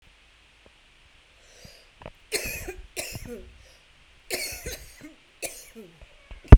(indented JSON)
{
  "three_cough_length": "6.6 s",
  "three_cough_amplitude": 32768,
  "three_cough_signal_mean_std_ratio": 0.16,
  "survey_phase": "beta (2021-08-13 to 2022-03-07)",
  "age": "18-44",
  "gender": "Female",
  "wearing_mask": "No",
  "symptom_cough_any": true,
  "symptom_sore_throat": true,
  "symptom_onset": "5 days",
  "smoker_status": "Current smoker (1 to 10 cigarettes per day)",
  "respiratory_condition_asthma": true,
  "respiratory_condition_other": false,
  "recruitment_source": "REACT",
  "submission_delay": "1 day",
  "covid_test_result": "Negative",
  "covid_test_method": "RT-qPCR"
}